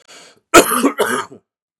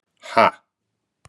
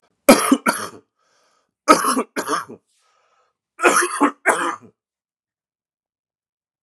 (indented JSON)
{
  "cough_length": "1.8 s",
  "cough_amplitude": 32768,
  "cough_signal_mean_std_ratio": 0.41,
  "exhalation_length": "1.3 s",
  "exhalation_amplitude": 31891,
  "exhalation_signal_mean_std_ratio": 0.26,
  "three_cough_length": "6.8 s",
  "three_cough_amplitude": 32768,
  "three_cough_signal_mean_std_ratio": 0.35,
  "survey_phase": "beta (2021-08-13 to 2022-03-07)",
  "age": "45-64",
  "gender": "Male",
  "wearing_mask": "No",
  "symptom_new_continuous_cough": true,
  "symptom_sore_throat": true,
  "symptom_headache": true,
  "symptom_onset": "2 days",
  "smoker_status": "Never smoked",
  "respiratory_condition_asthma": false,
  "respiratory_condition_other": false,
  "recruitment_source": "Test and Trace",
  "submission_delay": "1 day",
  "covid_test_result": "Positive",
  "covid_test_method": "RT-qPCR",
  "covid_ct_value": 16.3,
  "covid_ct_gene": "ORF1ab gene",
  "covid_ct_mean": 16.4,
  "covid_viral_load": "4000000 copies/ml",
  "covid_viral_load_category": "High viral load (>1M copies/ml)"
}